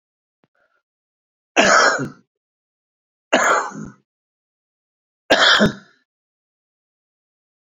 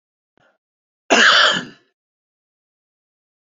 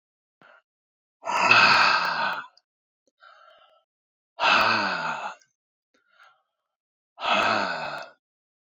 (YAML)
three_cough_length: 7.8 s
three_cough_amplitude: 32768
three_cough_signal_mean_std_ratio: 0.32
cough_length: 3.6 s
cough_amplitude: 30315
cough_signal_mean_std_ratio: 0.3
exhalation_length: 8.8 s
exhalation_amplitude: 25088
exhalation_signal_mean_std_ratio: 0.43
survey_phase: beta (2021-08-13 to 2022-03-07)
age: 65+
gender: Male
wearing_mask: 'No'
symptom_none: true
smoker_status: Ex-smoker
respiratory_condition_asthma: false
respiratory_condition_other: false
recruitment_source: REACT
submission_delay: 3 days
covid_test_result: Negative
covid_test_method: RT-qPCR
influenza_a_test_result: Negative
influenza_b_test_result: Negative